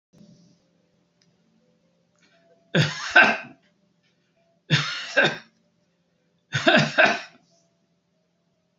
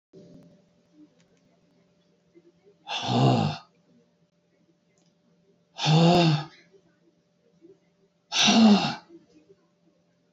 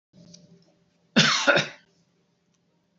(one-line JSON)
{"three_cough_length": "8.8 s", "three_cough_amplitude": 27411, "three_cough_signal_mean_std_ratio": 0.31, "exhalation_length": "10.3 s", "exhalation_amplitude": 14451, "exhalation_signal_mean_std_ratio": 0.35, "cough_length": "3.0 s", "cough_amplitude": 22671, "cough_signal_mean_std_ratio": 0.32, "survey_phase": "beta (2021-08-13 to 2022-03-07)", "age": "65+", "gender": "Male", "wearing_mask": "No", "symptom_cough_any": true, "symptom_runny_or_blocked_nose": true, "symptom_shortness_of_breath": true, "symptom_change_to_sense_of_smell_or_taste": true, "smoker_status": "Ex-smoker", "respiratory_condition_asthma": true, "respiratory_condition_other": false, "recruitment_source": "REACT", "submission_delay": "5 days", "covid_test_result": "Negative", "covid_test_method": "RT-qPCR"}